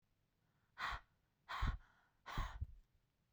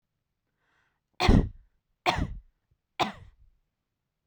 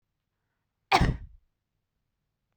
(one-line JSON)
{"exhalation_length": "3.3 s", "exhalation_amplitude": 1393, "exhalation_signal_mean_std_ratio": 0.4, "three_cough_length": "4.3 s", "three_cough_amplitude": 15506, "three_cough_signal_mean_std_ratio": 0.27, "cough_length": "2.6 s", "cough_amplitude": 13392, "cough_signal_mean_std_ratio": 0.24, "survey_phase": "beta (2021-08-13 to 2022-03-07)", "age": "18-44", "gender": "Female", "wearing_mask": "No", "symptom_none": true, "smoker_status": "Never smoked", "respiratory_condition_asthma": false, "respiratory_condition_other": false, "recruitment_source": "REACT", "submission_delay": "1 day", "covid_test_result": "Negative", "covid_test_method": "RT-qPCR"}